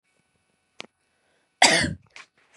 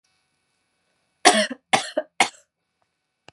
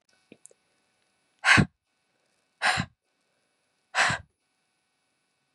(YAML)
cough_length: 2.6 s
cough_amplitude: 30356
cough_signal_mean_std_ratio: 0.26
three_cough_length: 3.3 s
three_cough_amplitude: 32481
three_cough_signal_mean_std_ratio: 0.26
exhalation_length: 5.5 s
exhalation_amplitude: 19268
exhalation_signal_mean_std_ratio: 0.25
survey_phase: beta (2021-08-13 to 2022-03-07)
age: 18-44
gender: Female
wearing_mask: 'No'
symptom_none: true
smoker_status: Never smoked
respiratory_condition_asthma: false
respiratory_condition_other: false
recruitment_source: REACT
submission_delay: 1 day
covid_test_result: Negative
covid_test_method: RT-qPCR
influenza_a_test_result: Negative
influenza_b_test_result: Negative